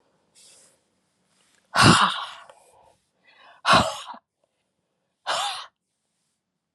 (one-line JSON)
{"exhalation_length": "6.7 s", "exhalation_amplitude": 31430, "exhalation_signal_mean_std_ratio": 0.29, "survey_phase": "beta (2021-08-13 to 2022-03-07)", "age": "45-64", "gender": "Female", "wearing_mask": "No", "symptom_cough_any": true, "symptom_runny_or_blocked_nose": true, "symptom_shortness_of_breath": true, "symptom_fatigue": true, "symptom_fever_high_temperature": true, "symptom_headache": true, "symptom_onset": "3 days", "smoker_status": "Never smoked", "respiratory_condition_asthma": false, "respiratory_condition_other": false, "recruitment_source": "Test and Trace", "submission_delay": "2 days", "covid_test_result": "Positive", "covid_test_method": "RT-qPCR", "covid_ct_value": 23.4, "covid_ct_gene": "N gene"}